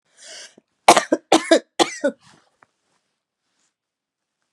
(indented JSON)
{
  "three_cough_length": "4.5 s",
  "three_cough_amplitude": 32768,
  "three_cough_signal_mean_std_ratio": 0.25,
  "survey_phase": "beta (2021-08-13 to 2022-03-07)",
  "age": "45-64",
  "gender": "Female",
  "wearing_mask": "No",
  "symptom_cough_any": true,
  "symptom_new_continuous_cough": true,
  "symptom_runny_or_blocked_nose": true,
  "symptom_sore_throat": true,
  "symptom_fatigue": true,
  "symptom_fever_high_temperature": true,
  "symptom_headache": true,
  "symptom_change_to_sense_of_smell_or_taste": true,
  "symptom_other": true,
  "symptom_onset": "2 days",
  "smoker_status": "Never smoked",
  "respiratory_condition_asthma": false,
  "respiratory_condition_other": false,
  "recruitment_source": "Test and Trace",
  "submission_delay": "1 day",
  "covid_test_result": "Positive",
  "covid_test_method": "ePCR"
}